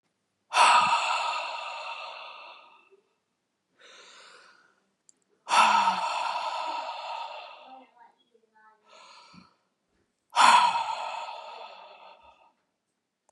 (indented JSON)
{
  "exhalation_length": "13.3 s",
  "exhalation_amplitude": 18755,
  "exhalation_signal_mean_std_ratio": 0.41,
  "survey_phase": "beta (2021-08-13 to 2022-03-07)",
  "age": "18-44",
  "gender": "Male",
  "wearing_mask": "No",
  "symptom_runny_or_blocked_nose": true,
  "smoker_status": "Ex-smoker",
  "respiratory_condition_asthma": false,
  "respiratory_condition_other": false,
  "recruitment_source": "REACT",
  "submission_delay": "1 day",
  "covid_test_result": "Negative",
  "covid_test_method": "RT-qPCR",
  "covid_ct_value": 38.8,
  "covid_ct_gene": "N gene",
  "influenza_a_test_result": "Negative",
  "influenza_b_test_result": "Negative"
}